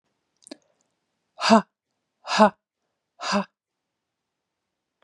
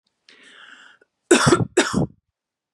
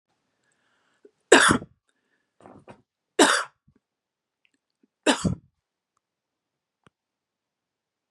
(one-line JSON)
{"exhalation_length": "5.0 s", "exhalation_amplitude": 28136, "exhalation_signal_mean_std_ratio": 0.23, "cough_length": "2.7 s", "cough_amplitude": 29226, "cough_signal_mean_std_ratio": 0.36, "three_cough_length": "8.1 s", "three_cough_amplitude": 32108, "three_cough_signal_mean_std_ratio": 0.22, "survey_phase": "beta (2021-08-13 to 2022-03-07)", "age": "18-44", "gender": "Female", "wearing_mask": "No", "symptom_none": true, "smoker_status": "Never smoked", "respiratory_condition_asthma": false, "respiratory_condition_other": false, "recruitment_source": "REACT", "submission_delay": "2 days", "covid_test_result": "Negative", "covid_test_method": "RT-qPCR", "influenza_a_test_result": "Negative", "influenza_b_test_result": "Negative"}